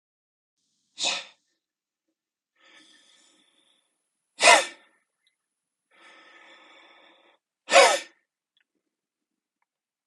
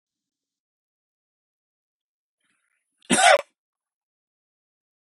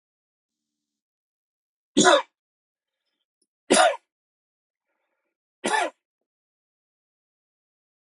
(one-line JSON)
{"exhalation_length": "10.1 s", "exhalation_amplitude": 24943, "exhalation_signal_mean_std_ratio": 0.19, "cough_length": "5.0 s", "cough_amplitude": 23281, "cough_signal_mean_std_ratio": 0.18, "three_cough_length": "8.1 s", "three_cough_amplitude": 23624, "three_cough_signal_mean_std_ratio": 0.22, "survey_phase": "beta (2021-08-13 to 2022-03-07)", "age": "45-64", "gender": "Male", "wearing_mask": "No", "symptom_none": true, "symptom_onset": "13 days", "smoker_status": "Never smoked", "respiratory_condition_asthma": true, "respiratory_condition_other": false, "recruitment_source": "REACT", "submission_delay": "1 day", "covid_test_result": "Negative", "covid_test_method": "RT-qPCR", "influenza_a_test_result": "Negative", "influenza_b_test_result": "Negative"}